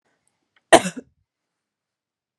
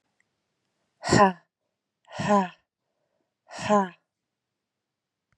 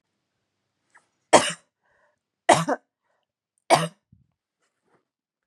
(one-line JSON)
{"cough_length": "2.4 s", "cough_amplitude": 32768, "cough_signal_mean_std_ratio": 0.15, "exhalation_length": "5.4 s", "exhalation_amplitude": 19630, "exhalation_signal_mean_std_ratio": 0.28, "three_cough_length": "5.5 s", "three_cough_amplitude": 31651, "three_cough_signal_mean_std_ratio": 0.21, "survey_phase": "beta (2021-08-13 to 2022-03-07)", "age": "18-44", "gender": "Female", "wearing_mask": "No", "symptom_none": true, "smoker_status": "Never smoked", "respiratory_condition_asthma": false, "respiratory_condition_other": false, "recruitment_source": "REACT", "submission_delay": "2 days", "covid_test_result": "Negative", "covid_test_method": "RT-qPCR", "influenza_a_test_result": "Negative", "influenza_b_test_result": "Negative"}